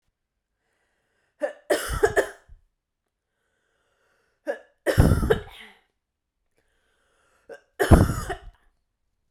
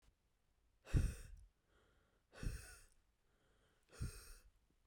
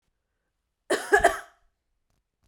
three_cough_length: 9.3 s
three_cough_amplitude: 32543
three_cough_signal_mean_std_ratio: 0.28
exhalation_length: 4.9 s
exhalation_amplitude: 1838
exhalation_signal_mean_std_ratio: 0.3
cough_length: 2.5 s
cough_amplitude: 16730
cough_signal_mean_std_ratio: 0.27
survey_phase: beta (2021-08-13 to 2022-03-07)
age: 18-44
gender: Female
wearing_mask: 'No'
symptom_diarrhoea: true
smoker_status: Never smoked
respiratory_condition_asthma: false
respiratory_condition_other: false
recruitment_source: REACT
submission_delay: 1 day
covid_test_result: Negative
covid_test_method: RT-qPCR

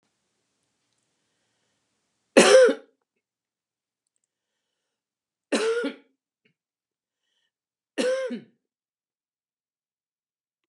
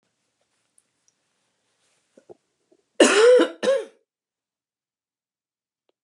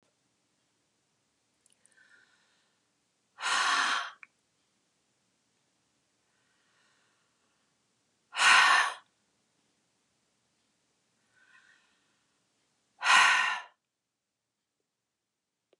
three_cough_length: 10.7 s
three_cough_amplitude: 29034
three_cough_signal_mean_std_ratio: 0.23
cough_length: 6.0 s
cough_amplitude: 27695
cough_signal_mean_std_ratio: 0.27
exhalation_length: 15.8 s
exhalation_amplitude: 11515
exhalation_signal_mean_std_ratio: 0.26
survey_phase: beta (2021-08-13 to 2022-03-07)
age: 65+
gender: Female
wearing_mask: 'No'
symptom_none: true
smoker_status: Ex-smoker
respiratory_condition_asthma: false
respiratory_condition_other: false
recruitment_source: REACT
submission_delay: 1 day
covid_test_result: Negative
covid_test_method: RT-qPCR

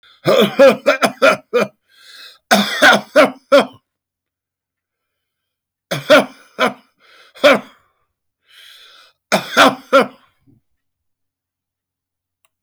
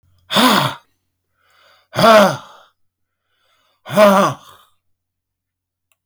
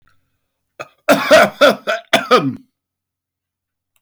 three_cough_length: 12.6 s
three_cough_amplitude: 32768
three_cough_signal_mean_std_ratio: 0.36
exhalation_length: 6.1 s
exhalation_amplitude: 31678
exhalation_signal_mean_std_ratio: 0.36
cough_length: 4.0 s
cough_amplitude: 30955
cough_signal_mean_std_ratio: 0.39
survey_phase: beta (2021-08-13 to 2022-03-07)
age: 65+
gender: Male
wearing_mask: 'No'
symptom_none: true
smoker_status: Never smoked
respiratory_condition_asthma: false
respiratory_condition_other: false
recruitment_source: REACT
submission_delay: 2 days
covid_test_result: Negative
covid_test_method: RT-qPCR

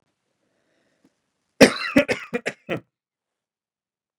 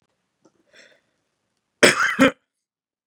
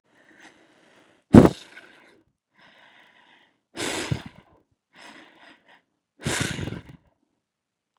three_cough_length: 4.2 s
three_cough_amplitude: 32768
three_cough_signal_mean_std_ratio: 0.22
cough_length: 3.1 s
cough_amplitude: 32744
cough_signal_mean_std_ratio: 0.26
exhalation_length: 8.0 s
exhalation_amplitude: 32768
exhalation_signal_mean_std_ratio: 0.18
survey_phase: beta (2021-08-13 to 2022-03-07)
age: 18-44
gender: Male
wearing_mask: 'No'
symptom_none: true
smoker_status: Ex-smoker
respiratory_condition_asthma: false
respiratory_condition_other: false
recruitment_source: Test and Trace
submission_delay: 3 days
covid_test_result: Negative
covid_test_method: RT-qPCR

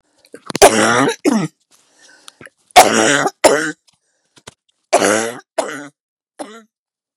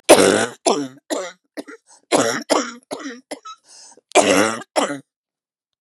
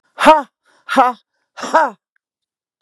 three_cough_length: 7.2 s
three_cough_amplitude: 32768
three_cough_signal_mean_std_ratio: 0.4
cough_length: 5.8 s
cough_amplitude: 32768
cough_signal_mean_std_ratio: 0.42
exhalation_length: 2.8 s
exhalation_amplitude: 32768
exhalation_signal_mean_std_ratio: 0.36
survey_phase: beta (2021-08-13 to 2022-03-07)
age: 65+
gender: Female
wearing_mask: 'No'
symptom_cough_any: true
symptom_fatigue: true
smoker_status: Ex-smoker
respiratory_condition_asthma: true
respiratory_condition_other: false
recruitment_source: REACT
submission_delay: 0 days
covid_test_result: Negative
covid_test_method: RT-qPCR
influenza_a_test_result: Negative
influenza_b_test_result: Negative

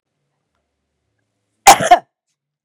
cough_length: 2.6 s
cough_amplitude: 32768
cough_signal_mean_std_ratio: 0.23
survey_phase: beta (2021-08-13 to 2022-03-07)
age: 45-64
gender: Female
wearing_mask: 'No'
symptom_none: true
smoker_status: Current smoker (1 to 10 cigarettes per day)
respiratory_condition_asthma: false
respiratory_condition_other: false
recruitment_source: REACT
submission_delay: 2 days
covid_test_result: Negative
covid_test_method: RT-qPCR
influenza_a_test_result: Negative
influenza_b_test_result: Negative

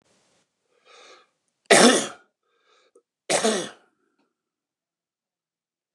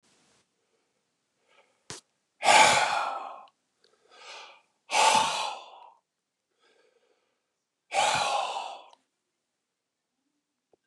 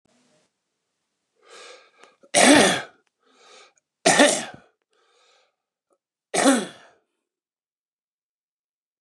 cough_length: 5.9 s
cough_amplitude: 28798
cough_signal_mean_std_ratio: 0.25
exhalation_length: 10.9 s
exhalation_amplitude: 18455
exhalation_signal_mean_std_ratio: 0.34
three_cough_length: 9.0 s
three_cough_amplitude: 29033
three_cough_signal_mean_std_ratio: 0.28
survey_phase: beta (2021-08-13 to 2022-03-07)
age: 65+
gender: Male
wearing_mask: 'No'
symptom_none: true
smoker_status: Never smoked
respiratory_condition_asthma: false
respiratory_condition_other: false
recruitment_source: REACT
submission_delay: 3 days
covid_test_result: Negative
covid_test_method: RT-qPCR
influenza_a_test_result: Negative
influenza_b_test_result: Negative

